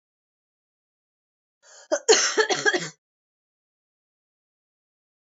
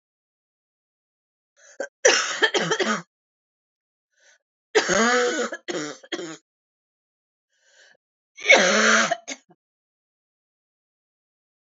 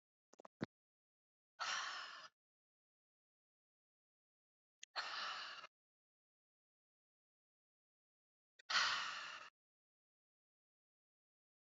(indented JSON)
{
  "cough_length": "5.2 s",
  "cough_amplitude": 21185,
  "cough_signal_mean_std_ratio": 0.28,
  "three_cough_length": "11.7 s",
  "three_cough_amplitude": 28152,
  "three_cough_signal_mean_std_ratio": 0.36,
  "exhalation_length": "11.6 s",
  "exhalation_amplitude": 2343,
  "exhalation_signal_mean_std_ratio": 0.29,
  "survey_phase": "beta (2021-08-13 to 2022-03-07)",
  "age": "18-44",
  "gender": "Female",
  "wearing_mask": "No",
  "symptom_cough_any": true,
  "symptom_runny_or_blocked_nose": true,
  "symptom_shortness_of_breath": true,
  "symptom_onset": "4 days",
  "smoker_status": "Never smoked",
  "respiratory_condition_asthma": false,
  "respiratory_condition_other": false,
  "recruitment_source": "Test and Trace",
  "submission_delay": "2 days",
  "covid_test_result": "Positive",
  "covid_test_method": "RT-qPCR",
  "covid_ct_value": 22.3,
  "covid_ct_gene": "ORF1ab gene"
}